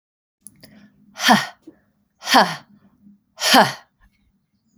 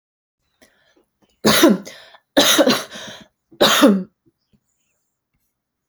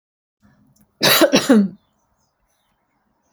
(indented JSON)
{
  "exhalation_length": "4.8 s",
  "exhalation_amplitude": 32767,
  "exhalation_signal_mean_std_ratio": 0.31,
  "three_cough_length": "5.9 s",
  "three_cough_amplitude": 30985,
  "three_cough_signal_mean_std_ratio": 0.38,
  "cough_length": "3.3 s",
  "cough_amplitude": 29797,
  "cough_signal_mean_std_ratio": 0.34,
  "survey_phase": "beta (2021-08-13 to 2022-03-07)",
  "age": "18-44",
  "gender": "Female",
  "wearing_mask": "No",
  "symptom_none": true,
  "smoker_status": "Never smoked",
  "respiratory_condition_asthma": false,
  "respiratory_condition_other": false,
  "recruitment_source": "REACT",
  "submission_delay": "3 days",
  "covid_test_result": "Negative",
  "covid_test_method": "RT-qPCR",
  "influenza_a_test_result": "Negative",
  "influenza_b_test_result": "Negative"
}